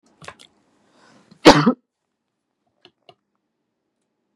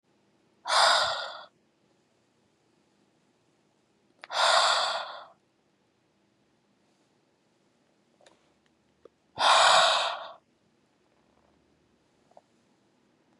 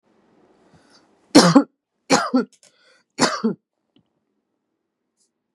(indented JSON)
{
  "cough_length": "4.4 s",
  "cough_amplitude": 32768,
  "cough_signal_mean_std_ratio": 0.18,
  "exhalation_length": "13.4 s",
  "exhalation_amplitude": 12925,
  "exhalation_signal_mean_std_ratio": 0.32,
  "three_cough_length": "5.5 s",
  "three_cough_amplitude": 32768,
  "three_cough_signal_mean_std_ratio": 0.27,
  "survey_phase": "beta (2021-08-13 to 2022-03-07)",
  "age": "18-44",
  "gender": "Male",
  "wearing_mask": "No",
  "symptom_none": true,
  "smoker_status": "Never smoked",
  "respiratory_condition_asthma": false,
  "respiratory_condition_other": false,
  "recruitment_source": "Test and Trace",
  "submission_delay": "1 day",
  "covid_test_result": "Positive",
  "covid_test_method": "RT-qPCR"
}